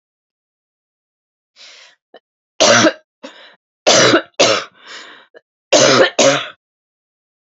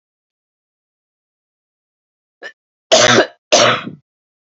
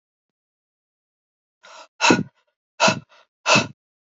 three_cough_length: 7.6 s
three_cough_amplitude: 32767
three_cough_signal_mean_std_ratio: 0.38
cough_length: 4.4 s
cough_amplitude: 32767
cough_signal_mean_std_ratio: 0.31
exhalation_length: 4.1 s
exhalation_amplitude: 27086
exhalation_signal_mean_std_ratio: 0.29
survey_phase: beta (2021-08-13 to 2022-03-07)
age: 18-44
gender: Female
wearing_mask: 'No'
symptom_cough_any: true
symptom_runny_or_blocked_nose: true
symptom_shortness_of_breath: true
symptom_sore_throat: true
symptom_diarrhoea: true
symptom_fatigue: true
symptom_headache: true
smoker_status: Ex-smoker
respiratory_condition_asthma: false
respiratory_condition_other: false
recruitment_source: Test and Trace
submission_delay: 1 day
covid_test_result: Positive
covid_test_method: RT-qPCR
covid_ct_value: 17.1
covid_ct_gene: ORF1ab gene
covid_ct_mean: 18.3
covid_viral_load: 960000 copies/ml
covid_viral_load_category: Low viral load (10K-1M copies/ml)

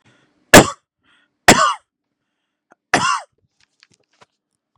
three_cough_length: 4.8 s
three_cough_amplitude: 32768
three_cough_signal_mean_std_ratio: 0.25
survey_phase: beta (2021-08-13 to 2022-03-07)
age: 18-44
gender: Male
wearing_mask: 'No'
symptom_none: true
smoker_status: Prefer not to say
respiratory_condition_asthma: false
respiratory_condition_other: false
recruitment_source: REACT
submission_delay: 0 days
covid_test_result: Negative
covid_test_method: RT-qPCR
influenza_a_test_result: Unknown/Void
influenza_b_test_result: Unknown/Void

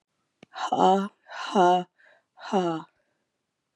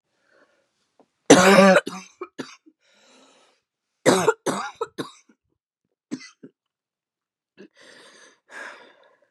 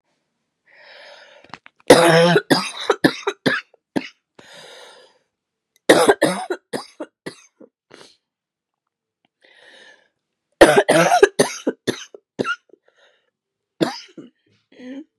exhalation_length: 3.8 s
exhalation_amplitude: 15579
exhalation_signal_mean_std_ratio: 0.43
cough_length: 9.3 s
cough_amplitude: 32767
cough_signal_mean_std_ratio: 0.26
three_cough_length: 15.2 s
three_cough_amplitude: 32768
three_cough_signal_mean_std_ratio: 0.32
survey_phase: beta (2021-08-13 to 2022-03-07)
age: 18-44
gender: Female
wearing_mask: 'No'
symptom_cough_any: true
symptom_new_continuous_cough: true
symptom_runny_or_blocked_nose: true
symptom_sore_throat: true
symptom_headache: true
symptom_onset: 3 days
smoker_status: Never smoked
respiratory_condition_asthma: false
respiratory_condition_other: false
recruitment_source: Test and Trace
submission_delay: 1 day
covid_test_result: Positive
covid_test_method: RT-qPCR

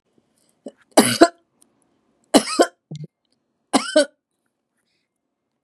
three_cough_length: 5.6 s
three_cough_amplitude: 32768
three_cough_signal_mean_std_ratio: 0.26
survey_phase: beta (2021-08-13 to 2022-03-07)
age: 65+
gender: Female
wearing_mask: 'No'
symptom_none: true
smoker_status: Ex-smoker
respiratory_condition_asthma: false
respiratory_condition_other: false
recruitment_source: REACT
submission_delay: 2 days
covid_test_result: Negative
covid_test_method: RT-qPCR
influenza_a_test_result: Negative
influenza_b_test_result: Negative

